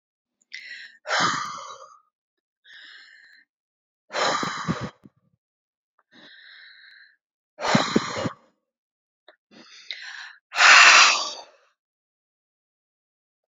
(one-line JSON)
{"exhalation_length": "13.5 s", "exhalation_amplitude": 32768, "exhalation_signal_mean_std_ratio": 0.3, "survey_phase": "beta (2021-08-13 to 2022-03-07)", "age": "65+", "gender": "Female", "wearing_mask": "No", "symptom_cough_any": true, "symptom_runny_or_blocked_nose": true, "smoker_status": "Ex-smoker", "respiratory_condition_asthma": false, "respiratory_condition_other": false, "recruitment_source": "Test and Trace", "submission_delay": "1 day", "covid_test_result": "Positive", "covid_test_method": "RT-qPCR", "covid_ct_value": 16.8, "covid_ct_gene": "ORF1ab gene", "covid_ct_mean": 17.0, "covid_viral_load": "2600000 copies/ml", "covid_viral_load_category": "High viral load (>1M copies/ml)"}